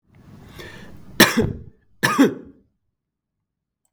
{"cough_length": "3.9 s", "cough_amplitude": 32768, "cough_signal_mean_std_ratio": 0.32, "survey_phase": "beta (2021-08-13 to 2022-03-07)", "age": "45-64", "gender": "Male", "wearing_mask": "No", "symptom_none": true, "smoker_status": "Never smoked", "respiratory_condition_asthma": false, "respiratory_condition_other": false, "recruitment_source": "REACT", "submission_delay": "1 day", "covid_test_result": "Negative", "covid_test_method": "RT-qPCR", "influenza_a_test_result": "Negative", "influenza_b_test_result": "Negative"}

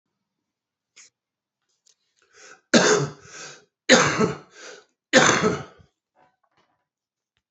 {"three_cough_length": "7.5 s", "three_cough_amplitude": 27260, "three_cough_signal_mean_std_ratio": 0.32, "survey_phase": "beta (2021-08-13 to 2022-03-07)", "age": "45-64", "gender": "Male", "wearing_mask": "Yes", "symptom_new_continuous_cough": true, "symptom_abdominal_pain": true, "symptom_diarrhoea": true, "symptom_fatigue": true, "symptom_change_to_sense_of_smell_or_taste": true, "symptom_loss_of_taste": true, "symptom_onset": "6 days", "smoker_status": "Current smoker (1 to 10 cigarettes per day)", "respiratory_condition_asthma": false, "respiratory_condition_other": false, "recruitment_source": "Test and Trace", "submission_delay": "2 days", "covid_test_result": "Positive", "covid_test_method": "RT-qPCR", "covid_ct_value": 18.4, "covid_ct_gene": "N gene", "covid_ct_mean": 18.7, "covid_viral_load": "710000 copies/ml", "covid_viral_load_category": "Low viral load (10K-1M copies/ml)"}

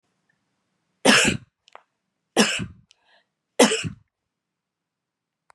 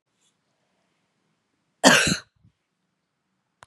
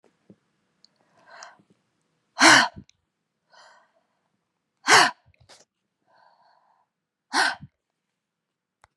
{"three_cough_length": "5.5 s", "three_cough_amplitude": 32600, "three_cough_signal_mean_std_ratio": 0.28, "cough_length": "3.7 s", "cough_amplitude": 32365, "cough_signal_mean_std_ratio": 0.22, "exhalation_length": "9.0 s", "exhalation_amplitude": 29091, "exhalation_signal_mean_std_ratio": 0.22, "survey_phase": "beta (2021-08-13 to 2022-03-07)", "age": "45-64", "gender": "Female", "wearing_mask": "No", "symptom_none": true, "smoker_status": "Ex-smoker", "respiratory_condition_asthma": false, "respiratory_condition_other": false, "recruitment_source": "REACT", "submission_delay": "3 days", "covid_test_result": "Negative", "covid_test_method": "RT-qPCR", "influenza_a_test_result": "Negative", "influenza_b_test_result": "Negative"}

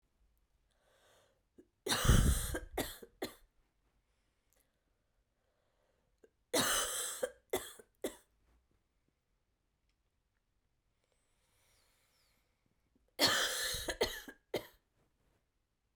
{"three_cough_length": "16.0 s", "three_cough_amplitude": 6005, "three_cough_signal_mean_std_ratio": 0.31, "survey_phase": "beta (2021-08-13 to 2022-03-07)", "age": "18-44", "gender": "Female", "wearing_mask": "No", "symptom_cough_any": true, "symptom_runny_or_blocked_nose": true, "symptom_fatigue": true, "symptom_change_to_sense_of_smell_or_taste": true, "smoker_status": "Never smoked", "respiratory_condition_asthma": false, "respiratory_condition_other": false, "recruitment_source": "Test and Trace", "submission_delay": "2 days", "covid_test_result": "Positive", "covid_test_method": "LFT"}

